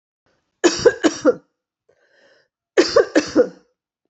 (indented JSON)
{
  "cough_length": "4.1 s",
  "cough_amplitude": 31238,
  "cough_signal_mean_std_ratio": 0.35,
  "survey_phase": "beta (2021-08-13 to 2022-03-07)",
  "age": "45-64",
  "gender": "Female",
  "wearing_mask": "No",
  "symptom_cough_any": true,
  "symptom_runny_or_blocked_nose": true,
  "symptom_fatigue": true,
  "symptom_headache": true,
  "symptom_other": true,
  "symptom_onset": "5 days",
  "smoker_status": "Never smoked",
  "respiratory_condition_asthma": false,
  "respiratory_condition_other": false,
  "recruitment_source": "Test and Trace",
  "submission_delay": "1 day",
  "covid_test_result": "Positive",
  "covid_test_method": "RT-qPCR",
  "covid_ct_value": 22.0,
  "covid_ct_gene": "ORF1ab gene"
}